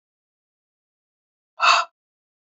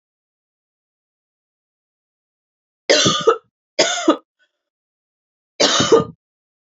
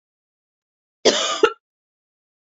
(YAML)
exhalation_length: 2.6 s
exhalation_amplitude: 27183
exhalation_signal_mean_std_ratio: 0.23
three_cough_length: 6.7 s
three_cough_amplitude: 29905
three_cough_signal_mean_std_ratio: 0.32
cough_length: 2.5 s
cough_amplitude: 27296
cough_signal_mean_std_ratio: 0.28
survey_phase: beta (2021-08-13 to 2022-03-07)
age: 45-64
gender: Female
wearing_mask: 'No'
symptom_cough_any: true
symptom_runny_or_blocked_nose: true
symptom_sore_throat: true
symptom_diarrhoea: true
symptom_fatigue: true
symptom_headache: true
symptom_onset: 3 days
smoker_status: Never smoked
respiratory_condition_asthma: false
respiratory_condition_other: false
recruitment_source: Test and Trace
submission_delay: 1 day
covid_test_result: Positive
covid_test_method: LAMP